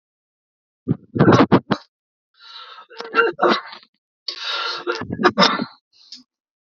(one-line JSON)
{"three_cough_length": "6.7 s", "three_cough_amplitude": 32768, "three_cough_signal_mean_std_ratio": 0.4, "survey_phase": "beta (2021-08-13 to 2022-03-07)", "age": "45-64", "gender": "Male", "wearing_mask": "No", "symptom_none": true, "smoker_status": "Never smoked", "respiratory_condition_asthma": false, "respiratory_condition_other": false, "recruitment_source": "REACT", "submission_delay": "0 days", "covid_test_result": "Negative", "covid_test_method": "RT-qPCR", "influenza_a_test_result": "Negative", "influenza_b_test_result": "Negative"}